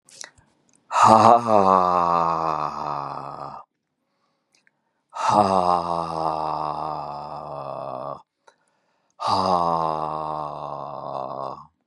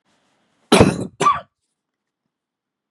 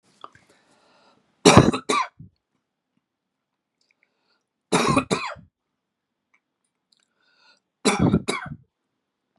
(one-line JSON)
{"exhalation_length": "11.9 s", "exhalation_amplitude": 32715, "exhalation_signal_mean_std_ratio": 0.5, "cough_length": "2.9 s", "cough_amplitude": 32768, "cough_signal_mean_std_ratio": 0.29, "three_cough_length": "9.4 s", "three_cough_amplitude": 32768, "three_cough_signal_mean_std_ratio": 0.27, "survey_phase": "beta (2021-08-13 to 2022-03-07)", "age": "45-64", "gender": "Male", "wearing_mask": "No", "symptom_none": true, "smoker_status": "Never smoked", "respiratory_condition_asthma": true, "respiratory_condition_other": false, "recruitment_source": "REACT", "submission_delay": "1 day", "covid_test_result": "Negative", "covid_test_method": "RT-qPCR", "influenza_a_test_result": "Negative", "influenza_b_test_result": "Negative"}